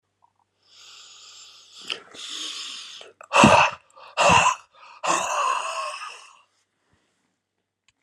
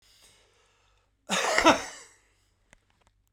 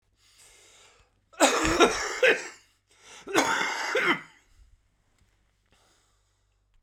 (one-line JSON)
{"exhalation_length": "8.0 s", "exhalation_amplitude": 31914, "exhalation_signal_mean_std_ratio": 0.38, "three_cough_length": "3.3 s", "three_cough_amplitude": 20689, "three_cough_signal_mean_std_ratio": 0.28, "cough_length": "6.8 s", "cough_amplitude": 22146, "cough_signal_mean_std_ratio": 0.4, "survey_phase": "alpha (2021-03-01 to 2021-08-12)", "age": "65+", "gender": "Male", "wearing_mask": "No", "symptom_cough_any": true, "symptom_abdominal_pain": true, "symptom_diarrhoea": true, "symptom_fatigue": true, "symptom_headache": true, "symptom_onset": "4 days", "smoker_status": "Never smoked", "respiratory_condition_asthma": false, "respiratory_condition_other": false, "recruitment_source": "Test and Trace", "submission_delay": "2 days", "covid_test_result": "Positive", "covid_test_method": "RT-qPCR", "covid_ct_value": 13.5, "covid_ct_gene": "N gene", "covid_ct_mean": 14.6, "covid_viral_load": "16000000 copies/ml", "covid_viral_load_category": "High viral load (>1M copies/ml)"}